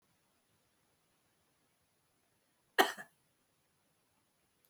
cough_length: 4.7 s
cough_amplitude: 7953
cough_signal_mean_std_ratio: 0.13
survey_phase: beta (2021-08-13 to 2022-03-07)
age: 45-64
gender: Female
wearing_mask: 'No'
symptom_none: true
smoker_status: Ex-smoker
respiratory_condition_asthma: true
respiratory_condition_other: false
recruitment_source: REACT
submission_delay: 5 days
covid_test_result: Negative
covid_test_method: RT-qPCR
influenza_a_test_result: Negative
influenza_b_test_result: Negative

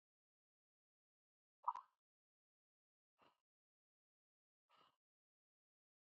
exhalation_length: 6.1 s
exhalation_amplitude: 1272
exhalation_signal_mean_std_ratio: 0.09
survey_phase: beta (2021-08-13 to 2022-03-07)
age: 45-64
gender: Male
wearing_mask: 'No'
symptom_cough_any: true
symptom_abdominal_pain: true
symptom_diarrhoea: true
symptom_fatigue: true
symptom_fever_high_temperature: true
symptom_headache: true
symptom_change_to_sense_of_smell_or_taste: true
symptom_loss_of_taste: true
symptom_onset: 4 days
smoker_status: Never smoked
respiratory_condition_asthma: true
respiratory_condition_other: false
recruitment_source: Test and Trace
submission_delay: 2 days
covid_test_result: Positive
covid_test_method: RT-qPCR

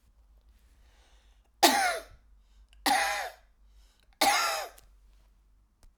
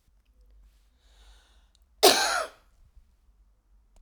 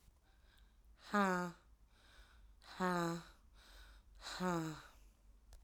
three_cough_length: 6.0 s
three_cough_amplitude: 19445
three_cough_signal_mean_std_ratio: 0.37
cough_length: 4.0 s
cough_amplitude: 29627
cough_signal_mean_std_ratio: 0.24
exhalation_length: 5.6 s
exhalation_amplitude: 2839
exhalation_signal_mean_std_ratio: 0.44
survey_phase: alpha (2021-03-01 to 2021-08-12)
age: 45-64
gender: Female
wearing_mask: 'No'
symptom_fatigue: true
symptom_onset: 9 days
smoker_status: Current smoker (1 to 10 cigarettes per day)
respiratory_condition_asthma: false
respiratory_condition_other: false
recruitment_source: REACT
submission_delay: 1 day
covid_test_result: Negative
covid_test_method: RT-qPCR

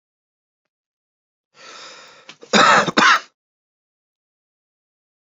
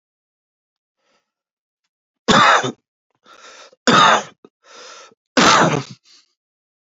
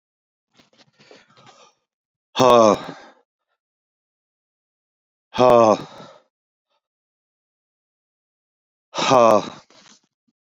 cough_length: 5.4 s
cough_amplitude: 30780
cough_signal_mean_std_ratio: 0.28
three_cough_length: 7.0 s
three_cough_amplitude: 32768
three_cough_signal_mean_std_ratio: 0.34
exhalation_length: 10.5 s
exhalation_amplitude: 28839
exhalation_signal_mean_std_ratio: 0.27
survey_phase: beta (2021-08-13 to 2022-03-07)
age: 45-64
gender: Male
wearing_mask: 'No'
symptom_cough_any: true
symptom_runny_or_blocked_nose: true
symptom_shortness_of_breath: true
symptom_fatigue: true
symptom_fever_high_temperature: true
symptom_change_to_sense_of_smell_or_taste: true
symptom_loss_of_taste: true
symptom_other: true
symptom_onset: 6 days
smoker_status: Never smoked
respiratory_condition_asthma: false
respiratory_condition_other: false
recruitment_source: Test and Trace
submission_delay: 2 days
covid_test_result: Positive
covid_test_method: ePCR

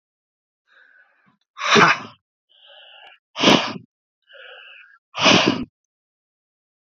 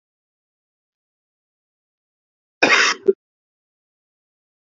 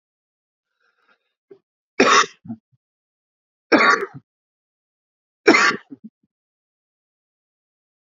exhalation_length: 6.9 s
exhalation_amplitude: 32767
exhalation_signal_mean_std_ratio: 0.32
cough_length: 4.7 s
cough_amplitude: 32767
cough_signal_mean_std_ratio: 0.21
three_cough_length: 8.0 s
three_cough_amplitude: 29617
three_cough_signal_mean_std_ratio: 0.26
survey_phase: beta (2021-08-13 to 2022-03-07)
age: 18-44
gender: Male
wearing_mask: 'No'
symptom_cough_any: true
symptom_new_continuous_cough: true
symptom_runny_or_blocked_nose: true
symptom_shortness_of_breath: true
symptom_sore_throat: true
symptom_abdominal_pain: true
symptom_diarrhoea: true
symptom_fatigue: true
symptom_fever_high_temperature: true
symptom_headache: true
symptom_change_to_sense_of_smell_or_taste: true
smoker_status: Ex-smoker
respiratory_condition_asthma: false
respiratory_condition_other: false
recruitment_source: Test and Trace
submission_delay: 2 days
covid_test_result: Positive
covid_test_method: RT-qPCR
covid_ct_value: 23.9
covid_ct_gene: ORF1ab gene
covid_ct_mean: 25.2
covid_viral_load: 5300 copies/ml
covid_viral_load_category: Minimal viral load (< 10K copies/ml)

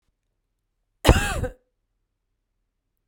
cough_length: 3.1 s
cough_amplitude: 32768
cough_signal_mean_std_ratio: 0.23
survey_phase: beta (2021-08-13 to 2022-03-07)
age: 45-64
gender: Female
wearing_mask: 'No'
symptom_none: true
smoker_status: Never smoked
respiratory_condition_asthma: false
respiratory_condition_other: false
recruitment_source: REACT
submission_delay: 2 days
covid_test_result: Negative
covid_test_method: RT-qPCR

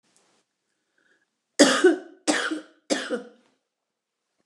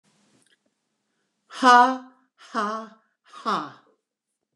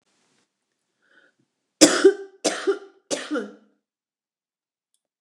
cough_length: 4.5 s
cough_amplitude: 28486
cough_signal_mean_std_ratio: 0.32
exhalation_length: 4.6 s
exhalation_amplitude: 24241
exhalation_signal_mean_std_ratio: 0.28
three_cough_length: 5.2 s
three_cough_amplitude: 29204
three_cough_signal_mean_std_ratio: 0.26
survey_phase: beta (2021-08-13 to 2022-03-07)
age: 45-64
gender: Female
wearing_mask: 'No'
symptom_none: true
symptom_onset: 12 days
smoker_status: Ex-smoker
respiratory_condition_asthma: true
respiratory_condition_other: false
recruitment_source: REACT
submission_delay: 3 days
covid_test_result: Negative
covid_test_method: RT-qPCR
influenza_a_test_result: Negative
influenza_b_test_result: Negative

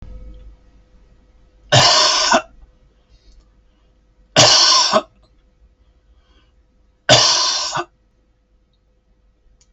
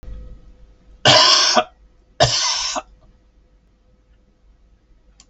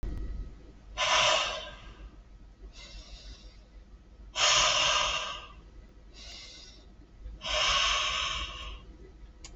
three_cough_length: 9.7 s
three_cough_amplitude: 32768
three_cough_signal_mean_std_ratio: 0.38
cough_length: 5.3 s
cough_amplitude: 32768
cough_signal_mean_std_ratio: 0.38
exhalation_length: 9.6 s
exhalation_amplitude: 8149
exhalation_signal_mean_std_ratio: 0.58
survey_phase: alpha (2021-03-01 to 2021-08-12)
age: 65+
gender: Male
wearing_mask: 'No'
symptom_none: true
smoker_status: Never smoked
respiratory_condition_asthma: false
respiratory_condition_other: false
recruitment_source: REACT
submission_delay: 2 days
covid_test_result: Negative
covid_test_method: RT-qPCR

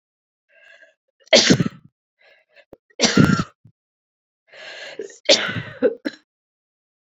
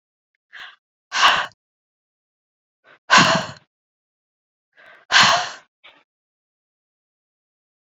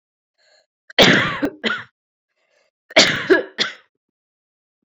three_cough_length: 7.2 s
three_cough_amplitude: 32768
three_cough_signal_mean_std_ratio: 0.31
exhalation_length: 7.9 s
exhalation_amplitude: 29905
exhalation_signal_mean_std_ratio: 0.28
cough_length: 4.9 s
cough_amplitude: 32767
cough_signal_mean_std_ratio: 0.35
survey_phase: beta (2021-08-13 to 2022-03-07)
age: 18-44
gender: Female
wearing_mask: 'No'
symptom_cough_any: true
symptom_runny_or_blocked_nose: true
symptom_fatigue: true
symptom_headache: true
symptom_other: true
symptom_onset: 3 days
smoker_status: Never smoked
respiratory_condition_asthma: false
respiratory_condition_other: false
recruitment_source: Test and Trace
submission_delay: 2 days
covid_test_result: Positive
covid_test_method: ePCR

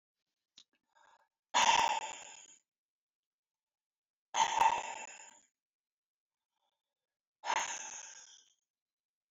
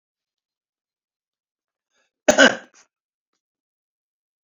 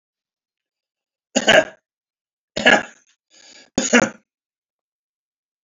exhalation_length: 9.3 s
exhalation_amplitude: 5344
exhalation_signal_mean_std_ratio: 0.31
cough_length: 4.4 s
cough_amplitude: 29838
cough_signal_mean_std_ratio: 0.16
three_cough_length: 5.6 s
three_cough_amplitude: 30579
three_cough_signal_mean_std_ratio: 0.26
survey_phase: beta (2021-08-13 to 2022-03-07)
age: 65+
gender: Male
wearing_mask: 'No'
symptom_none: true
smoker_status: Ex-smoker
respiratory_condition_asthma: false
respiratory_condition_other: false
recruitment_source: REACT
submission_delay: 1 day
covid_test_result: Negative
covid_test_method: RT-qPCR
influenza_a_test_result: Negative
influenza_b_test_result: Negative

